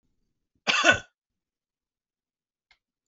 cough_length: 3.1 s
cough_amplitude: 20361
cough_signal_mean_std_ratio: 0.23
survey_phase: beta (2021-08-13 to 2022-03-07)
age: 45-64
gender: Male
wearing_mask: 'No'
symptom_runny_or_blocked_nose: true
symptom_sore_throat: true
symptom_onset: 11 days
smoker_status: Never smoked
respiratory_condition_asthma: false
respiratory_condition_other: false
recruitment_source: REACT
submission_delay: 2 days
covid_test_result: Negative
covid_test_method: RT-qPCR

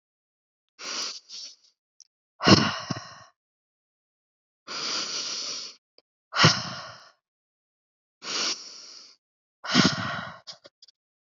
exhalation_length: 11.3 s
exhalation_amplitude: 25829
exhalation_signal_mean_std_ratio: 0.34
survey_phase: beta (2021-08-13 to 2022-03-07)
age: 18-44
gender: Female
wearing_mask: 'No'
symptom_change_to_sense_of_smell_or_taste: true
smoker_status: Ex-smoker
respiratory_condition_asthma: false
respiratory_condition_other: false
recruitment_source: REACT
submission_delay: 2 days
covid_test_result: Negative
covid_test_method: RT-qPCR
influenza_a_test_result: Negative
influenza_b_test_result: Negative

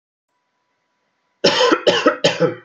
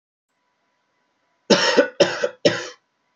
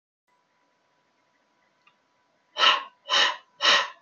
cough_length: 2.6 s
cough_amplitude: 30163
cough_signal_mean_std_ratio: 0.46
three_cough_length: 3.2 s
three_cough_amplitude: 28535
three_cough_signal_mean_std_ratio: 0.36
exhalation_length: 4.0 s
exhalation_amplitude: 19366
exhalation_signal_mean_std_ratio: 0.34
survey_phase: alpha (2021-03-01 to 2021-08-12)
age: 18-44
gender: Male
wearing_mask: 'No'
symptom_fatigue: true
symptom_onset: 12 days
smoker_status: Ex-smoker
respiratory_condition_asthma: false
respiratory_condition_other: false
recruitment_source: REACT
submission_delay: 1 day
covid_test_result: Negative
covid_test_method: RT-qPCR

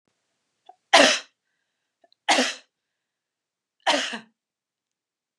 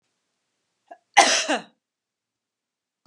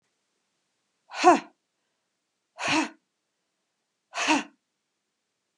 three_cough_length: 5.4 s
three_cough_amplitude: 29203
three_cough_signal_mean_std_ratio: 0.27
cough_length: 3.1 s
cough_amplitude: 29203
cough_signal_mean_std_ratio: 0.25
exhalation_length: 5.6 s
exhalation_amplitude: 21015
exhalation_signal_mean_std_ratio: 0.26
survey_phase: beta (2021-08-13 to 2022-03-07)
age: 45-64
gender: Female
wearing_mask: 'No'
symptom_runny_or_blocked_nose: true
symptom_fatigue: true
symptom_onset: 2 days
smoker_status: Never smoked
respiratory_condition_asthma: false
respiratory_condition_other: false
recruitment_source: Test and Trace
submission_delay: 1 day
covid_test_result: Negative
covid_test_method: RT-qPCR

